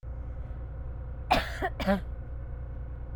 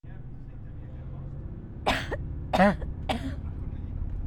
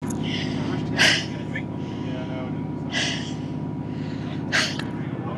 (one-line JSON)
{"cough_length": "3.2 s", "cough_amplitude": 9653, "cough_signal_mean_std_ratio": 0.86, "three_cough_length": "4.3 s", "three_cough_amplitude": 15335, "three_cough_signal_mean_std_ratio": 0.72, "exhalation_length": "5.4 s", "exhalation_amplitude": 21558, "exhalation_signal_mean_std_ratio": 1.01, "survey_phase": "alpha (2021-03-01 to 2021-08-12)", "age": "45-64", "gender": "Female", "wearing_mask": "Yes", "symptom_none": true, "smoker_status": "Never smoked", "respiratory_condition_asthma": true, "respiratory_condition_other": false, "recruitment_source": "REACT", "submission_delay": "2 days", "covid_test_result": "Negative", "covid_test_method": "RT-qPCR"}